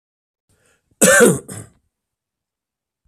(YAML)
cough_length: 3.1 s
cough_amplitude: 32768
cough_signal_mean_std_ratio: 0.29
survey_phase: beta (2021-08-13 to 2022-03-07)
age: 45-64
gender: Male
wearing_mask: 'No'
symptom_cough_any: true
symptom_runny_or_blocked_nose: true
symptom_shortness_of_breath: true
symptom_sore_throat: true
symptom_fatigue: true
symptom_headache: true
symptom_onset: 3 days
smoker_status: Never smoked
respiratory_condition_asthma: false
respiratory_condition_other: false
recruitment_source: Test and Trace
submission_delay: 1 day
covid_test_result: Positive
covid_test_method: ePCR